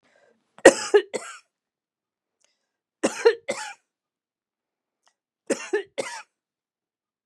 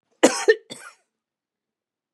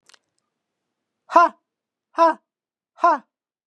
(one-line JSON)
{"three_cough_length": "7.3 s", "three_cough_amplitude": 32768, "three_cough_signal_mean_std_ratio": 0.21, "cough_length": "2.1 s", "cough_amplitude": 29043, "cough_signal_mean_std_ratio": 0.24, "exhalation_length": "3.7 s", "exhalation_amplitude": 28278, "exhalation_signal_mean_std_ratio": 0.28, "survey_phase": "beta (2021-08-13 to 2022-03-07)", "age": "65+", "gender": "Female", "wearing_mask": "No", "symptom_abdominal_pain": true, "smoker_status": "Never smoked", "respiratory_condition_asthma": false, "respiratory_condition_other": false, "recruitment_source": "Test and Trace", "submission_delay": "0 days", "covid_test_result": "Negative", "covid_test_method": "LFT"}